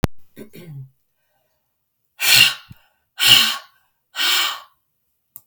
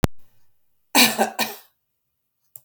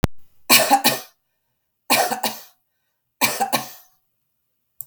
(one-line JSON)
{"exhalation_length": "5.5 s", "exhalation_amplitude": 32768, "exhalation_signal_mean_std_ratio": 0.37, "cough_length": "2.6 s", "cough_amplitude": 32768, "cough_signal_mean_std_ratio": 0.34, "three_cough_length": "4.9 s", "three_cough_amplitude": 32768, "three_cough_signal_mean_std_ratio": 0.39, "survey_phase": "beta (2021-08-13 to 2022-03-07)", "age": "65+", "gender": "Female", "wearing_mask": "No", "symptom_none": true, "smoker_status": "Ex-smoker", "respiratory_condition_asthma": true, "respiratory_condition_other": false, "recruitment_source": "REACT", "submission_delay": "2 days", "covid_test_result": "Negative", "covid_test_method": "RT-qPCR"}